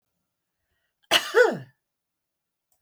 {"cough_length": "2.8 s", "cough_amplitude": 23764, "cough_signal_mean_std_ratio": 0.26, "survey_phase": "beta (2021-08-13 to 2022-03-07)", "age": "65+", "gender": "Female", "wearing_mask": "No", "symptom_none": true, "smoker_status": "Never smoked", "respiratory_condition_asthma": false, "respiratory_condition_other": false, "recruitment_source": "REACT", "submission_delay": "1 day", "covid_test_result": "Negative", "covid_test_method": "RT-qPCR"}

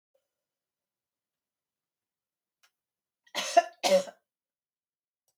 {"cough_length": "5.4 s", "cough_amplitude": 13188, "cough_signal_mean_std_ratio": 0.19, "survey_phase": "beta (2021-08-13 to 2022-03-07)", "age": "65+", "gender": "Female", "wearing_mask": "No", "symptom_cough_any": true, "smoker_status": "Never smoked", "respiratory_condition_asthma": false, "respiratory_condition_other": false, "recruitment_source": "REACT", "submission_delay": "3 days", "covid_test_result": "Negative", "covid_test_method": "RT-qPCR", "influenza_a_test_result": "Negative", "influenza_b_test_result": "Negative"}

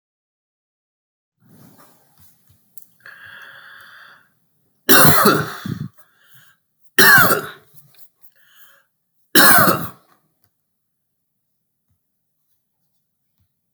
{"three_cough_length": "13.7 s", "three_cough_amplitude": 32768, "three_cough_signal_mean_std_ratio": 0.28, "survey_phase": "beta (2021-08-13 to 2022-03-07)", "age": "65+", "gender": "Male", "wearing_mask": "No", "symptom_cough_any": true, "symptom_sore_throat": true, "symptom_fatigue": true, "smoker_status": "Ex-smoker", "respiratory_condition_asthma": false, "respiratory_condition_other": false, "recruitment_source": "Test and Trace", "submission_delay": "1 day", "covid_test_result": "Positive", "covid_test_method": "RT-qPCR", "covid_ct_value": 24.3, "covid_ct_gene": "ORF1ab gene", "covid_ct_mean": 25.1, "covid_viral_load": "5900 copies/ml", "covid_viral_load_category": "Minimal viral load (< 10K copies/ml)"}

